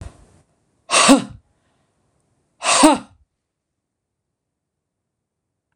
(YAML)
exhalation_length: 5.8 s
exhalation_amplitude: 26028
exhalation_signal_mean_std_ratio: 0.27
survey_phase: beta (2021-08-13 to 2022-03-07)
age: 65+
gender: Female
wearing_mask: 'No'
symptom_none: true
smoker_status: Never smoked
respiratory_condition_asthma: true
respiratory_condition_other: false
recruitment_source: REACT
submission_delay: 2 days
covid_test_result: Negative
covid_test_method: RT-qPCR
influenza_a_test_result: Negative
influenza_b_test_result: Negative